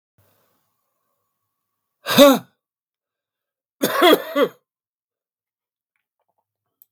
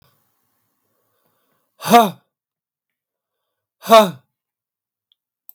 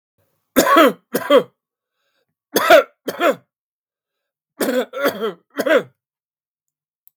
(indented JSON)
{
  "cough_length": "6.9 s",
  "cough_amplitude": 32768,
  "cough_signal_mean_std_ratio": 0.25,
  "exhalation_length": "5.5 s",
  "exhalation_amplitude": 32768,
  "exhalation_signal_mean_std_ratio": 0.22,
  "three_cough_length": "7.2 s",
  "three_cough_amplitude": 32768,
  "three_cough_signal_mean_std_ratio": 0.38,
  "survey_phase": "beta (2021-08-13 to 2022-03-07)",
  "age": "65+",
  "gender": "Male",
  "wearing_mask": "No",
  "symptom_none": true,
  "smoker_status": "Ex-smoker",
  "respiratory_condition_asthma": false,
  "respiratory_condition_other": false,
  "recruitment_source": "REACT",
  "submission_delay": "1 day",
  "covid_test_result": "Negative",
  "covid_test_method": "RT-qPCR",
  "influenza_a_test_result": "Negative",
  "influenza_b_test_result": "Negative"
}